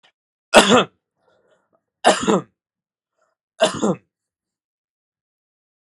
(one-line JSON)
{"three_cough_length": "5.8 s", "three_cough_amplitude": 32768, "three_cough_signal_mean_std_ratio": 0.27, "survey_phase": "beta (2021-08-13 to 2022-03-07)", "age": "45-64", "gender": "Male", "wearing_mask": "No", "symptom_none": true, "smoker_status": "Ex-smoker", "respiratory_condition_asthma": false, "respiratory_condition_other": false, "recruitment_source": "REACT", "submission_delay": "1 day", "covid_test_result": "Negative", "covid_test_method": "RT-qPCR", "influenza_a_test_result": "Negative", "influenza_b_test_result": "Negative"}